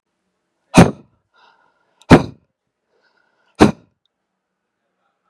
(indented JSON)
{
  "exhalation_length": "5.3 s",
  "exhalation_amplitude": 32768,
  "exhalation_signal_mean_std_ratio": 0.2,
  "survey_phase": "beta (2021-08-13 to 2022-03-07)",
  "age": "45-64",
  "gender": "Male",
  "wearing_mask": "No",
  "symptom_fatigue": true,
  "symptom_fever_high_temperature": true,
  "symptom_headache": true,
  "symptom_onset": "5 days",
  "smoker_status": "Ex-smoker",
  "respiratory_condition_asthma": false,
  "respiratory_condition_other": false,
  "recruitment_source": "Test and Trace",
  "submission_delay": "2 days",
  "covid_test_result": "Positive",
  "covid_test_method": "RT-qPCR",
  "covid_ct_value": 23.0,
  "covid_ct_gene": "N gene"
}